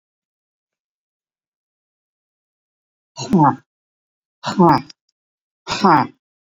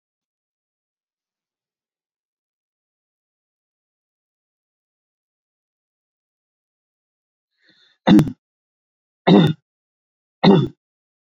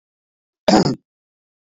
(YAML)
exhalation_length: 6.6 s
exhalation_amplitude: 28504
exhalation_signal_mean_std_ratio: 0.29
three_cough_length: 11.3 s
three_cough_amplitude: 30044
three_cough_signal_mean_std_ratio: 0.2
cough_length: 1.6 s
cough_amplitude: 27927
cough_signal_mean_std_ratio: 0.3
survey_phase: beta (2021-08-13 to 2022-03-07)
age: 65+
gender: Male
wearing_mask: 'No'
symptom_none: true
smoker_status: Ex-smoker
respiratory_condition_asthma: false
respiratory_condition_other: false
recruitment_source: REACT
submission_delay: 0 days
covid_test_result: Negative
covid_test_method: RT-qPCR
influenza_a_test_result: Negative
influenza_b_test_result: Negative